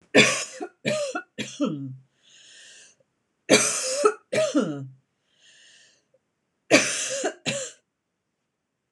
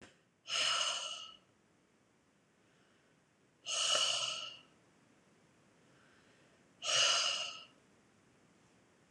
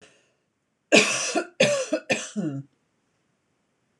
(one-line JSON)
{"three_cough_length": "8.9 s", "three_cough_amplitude": 25724, "three_cough_signal_mean_std_ratio": 0.42, "exhalation_length": "9.1 s", "exhalation_amplitude": 4168, "exhalation_signal_mean_std_ratio": 0.42, "cough_length": "4.0 s", "cough_amplitude": 25148, "cough_signal_mean_std_ratio": 0.4, "survey_phase": "beta (2021-08-13 to 2022-03-07)", "age": "18-44", "gender": "Female", "wearing_mask": "No", "symptom_none": true, "smoker_status": "Never smoked", "respiratory_condition_asthma": false, "respiratory_condition_other": false, "recruitment_source": "REACT", "submission_delay": "3 days", "covid_test_result": "Negative", "covid_test_method": "RT-qPCR"}